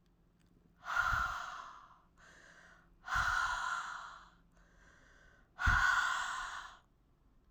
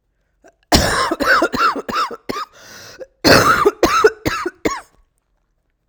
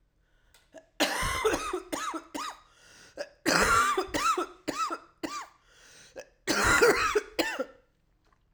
{
  "exhalation_length": "7.5 s",
  "exhalation_amplitude": 3786,
  "exhalation_signal_mean_std_ratio": 0.51,
  "cough_length": "5.9 s",
  "cough_amplitude": 32768,
  "cough_signal_mean_std_ratio": 0.52,
  "three_cough_length": "8.5 s",
  "three_cough_amplitude": 12270,
  "three_cough_signal_mean_std_ratio": 0.53,
  "survey_phase": "alpha (2021-03-01 to 2021-08-12)",
  "age": "45-64",
  "gender": "Female",
  "wearing_mask": "No",
  "symptom_cough_any": true,
  "symptom_shortness_of_breath": true,
  "symptom_abdominal_pain": true,
  "symptom_fatigue": true,
  "symptom_fever_high_temperature": true,
  "symptom_change_to_sense_of_smell_or_taste": true,
  "symptom_loss_of_taste": true,
  "smoker_status": "Ex-smoker",
  "respiratory_condition_asthma": false,
  "respiratory_condition_other": false,
  "recruitment_source": "Test and Trace",
  "submission_delay": "1 day",
  "covid_test_result": "Positive",
  "covid_test_method": "RT-qPCR",
  "covid_ct_value": 17.9,
  "covid_ct_gene": "N gene",
  "covid_ct_mean": 19.1,
  "covid_viral_load": "540000 copies/ml",
  "covid_viral_load_category": "Low viral load (10K-1M copies/ml)"
}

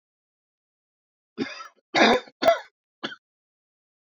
{
  "cough_length": "4.0 s",
  "cough_amplitude": 22386,
  "cough_signal_mean_std_ratio": 0.29,
  "survey_phase": "beta (2021-08-13 to 2022-03-07)",
  "age": "45-64",
  "gender": "Male",
  "wearing_mask": "No",
  "symptom_cough_any": true,
  "symptom_new_continuous_cough": true,
  "symptom_runny_or_blocked_nose": true,
  "symptom_shortness_of_breath": true,
  "symptom_headache": true,
  "symptom_change_to_sense_of_smell_or_taste": true,
  "symptom_onset": "3 days",
  "smoker_status": "Ex-smoker",
  "respiratory_condition_asthma": false,
  "respiratory_condition_other": false,
  "recruitment_source": "Test and Trace",
  "submission_delay": "2 days",
  "covid_test_result": "Positive",
  "covid_test_method": "RT-qPCR",
  "covid_ct_value": 14.9,
  "covid_ct_gene": "ORF1ab gene",
  "covid_ct_mean": 16.0,
  "covid_viral_load": "5700000 copies/ml",
  "covid_viral_load_category": "High viral load (>1M copies/ml)"
}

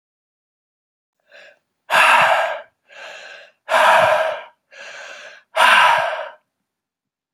{
  "exhalation_length": "7.3 s",
  "exhalation_amplitude": 30544,
  "exhalation_signal_mean_std_ratio": 0.45,
  "survey_phase": "beta (2021-08-13 to 2022-03-07)",
  "age": "18-44",
  "gender": "Male",
  "wearing_mask": "No",
  "symptom_cough_any": true,
  "symptom_sore_throat": true,
  "symptom_other": true,
  "symptom_onset": "2 days",
  "smoker_status": "Never smoked",
  "respiratory_condition_asthma": false,
  "respiratory_condition_other": false,
  "recruitment_source": "Test and Trace",
  "submission_delay": "1 day",
  "covid_test_result": "Positive",
  "covid_test_method": "RT-qPCR",
  "covid_ct_value": 20.1,
  "covid_ct_gene": "ORF1ab gene"
}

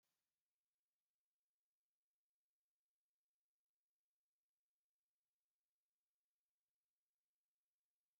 {
  "exhalation_length": "8.2 s",
  "exhalation_amplitude": 5,
  "exhalation_signal_mean_std_ratio": 0.19,
  "survey_phase": "beta (2021-08-13 to 2022-03-07)",
  "age": "65+",
  "gender": "Female",
  "wearing_mask": "No",
  "symptom_none": true,
  "smoker_status": "Ex-smoker",
  "respiratory_condition_asthma": false,
  "respiratory_condition_other": false,
  "recruitment_source": "REACT",
  "submission_delay": "3 days",
  "covid_test_result": "Negative",
  "covid_test_method": "RT-qPCR"
}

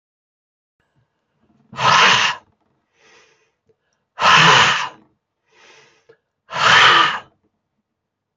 {
  "exhalation_length": "8.4 s",
  "exhalation_amplitude": 30313,
  "exhalation_signal_mean_std_ratio": 0.38,
  "survey_phase": "beta (2021-08-13 to 2022-03-07)",
  "age": "65+",
  "gender": "Male",
  "wearing_mask": "No",
  "symptom_none": true,
  "symptom_onset": "11 days",
  "smoker_status": "Ex-smoker",
  "respiratory_condition_asthma": false,
  "respiratory_condition_other": false,
  "recruitment_source": "REACT",
  "submission_delay": "3 days",
  "covid_test_result": "Negative",
  "covid_test_method": "RT-qPCR",
  "influenza_a_test_result": "Negative",
  "influenza_b_test_result": "Negative"
}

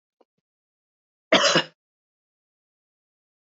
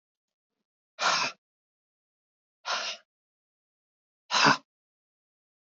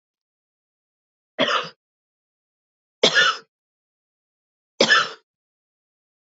{
  "cough_length": "3.5 s",
  "cough_amplitude": 22860,
  "cough_signal_mean_std_ratio": 0.23,
  "exhalation_length": "5.6 s",
  "exhalation_amplitude": 14849,
  "exhalation_signal_mean_std_ratio": 0.27,
  "three_cough_length": "6.4 s",
  "three_cough_amplitude": 27875,
  "three_cough_signal_mean_std_ratio": 0.27,
  "survey_phase": "beta (2021-08-13 to 2022-03-07)",
  "age": "45-64",
  "gender": "Female",
  "wearing_mask": "No",
  "symptom_none": true,
  "symptom_onset": "13 days",
  "smoker_status": "Never smoked",
  "respiratory_condition_asthma": true,
  "respiratory_condition_other": false,
  "recruitment_source": "REACT",
  "submission_delay": "3 days",
  "covid_test_result": "Negative",
  "covid_test_method": "RT-qPCR",
  "influenza_a_test_result": "Negative",
  "influenza_b_test_result": "Negative"
}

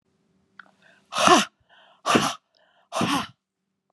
{
  "exhalation_length": "3.9 s",
  "exhalation_amplitude": 32767,
  "exhalation_signal_mean_std_ratio": 0.35,
  "survey_phase": "beta (2021-08-13 to 2022-03-07)",
  "age": "45-64",
  "gender": "Female",
  "wearing_mask": "No",
  "symptom_none": true,
  "smoker_status": "Never smoked",
  "respiratory_condition_asthma": false,
  "respiratory_condition_other": false,
  "recruitment_source": "REACT",
  "submission_delay": "2 days",
  "covid_test_result": "Negative",
  "covid_test_method": "RT-qPCR"
}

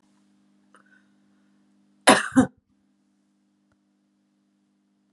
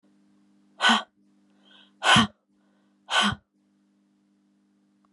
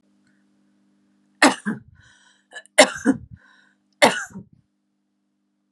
{
  "cough_length": "5.1 s",
  "cough_amplitude": 28806,
  "cough_signal_mean_std_ratio": 0.18,
  "exhalation_length": "5.1 s",
  "exhalation_amplitude": 18958,
  "exhalation_signal_mean_std_ratio": 0.29,
  "three_cough_length": "5.7 s",
  "three_cough_amplitude": 32747,
  "three_cough_signal_mean_std_ratio": 0.24,
  "survey_phase": "alpha (2021-03-01 to 2021-08-12)",
  "age": "45-64",
  "gender": "Female",
  "wearing_mask": "No",
  "symptom_none": true,
  "smoker_status": "Ex-smoker",
  "respiratory_condition_asthma": false,
  "respiratory_condition_other": false,
  "recruitment_source": "REACT",
  "submission_delay": "2 days",
  "covid_test_result": "Negative",
  "covid_test_method": "RT-qPCR"
}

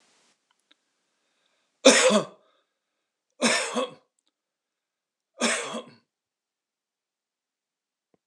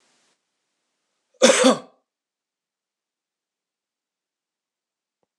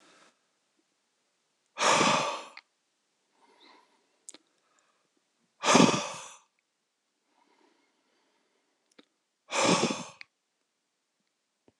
{
  "three_cough_length": "8.3 s",
  "three_cough_amplitude": 25663,
  "three_cough_signal_mean_std_ratio": 0.26,
  "cough_length": "5.4 s",
  "cough_amplitude": 26027,
  "cough_signal_mean_std_ratio": 0.19,
  "exhalation_length": "11.8 s",
  "exhalation_amplitude": 17522,
  "exhalation_signal_mean_std_ratio": 0.27,
  "survey_phase": "beta (2021-08-13 to 2022-03-07)",
  "age": "65+",
  "gender": "Male",
  "wearing_mask": "No",
  "symptom_none": true,
  "smoker_status": "Never smoked",
  "respiratory_condition_asthma": false,
  "respiratory_condition_other": false,
  "recruitment_source": "REACT",
  "submission_delay": "2 days",
  "covid_test_result": "Negative",
  "covid_test_method": "RT-qPCR",
  "influenza_a_test_result": "Unknown/Void",
  "influenza_b_test_result": "Unknown/Void"
}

